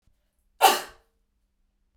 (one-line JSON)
{"cough_length": "2.0 s", "cough_amplitude": 23574, "cough_signal_mean_std_ratio": 0.23, "survey_phase": "beta (2021-08-13 to 2022-03-07)", "age": "45-64", "gender": "Female", "wearing_mask": "No", "symptom_none": true, "smoker_status": "Never smoked", "respiratory_condition_asthma": false, "respiratory_condition_other": false, "recruitment_source": "REACT", "submission_delay": "1 day", "covid_test_result": "Negative", "covid_test_method": "RT-qPCR"}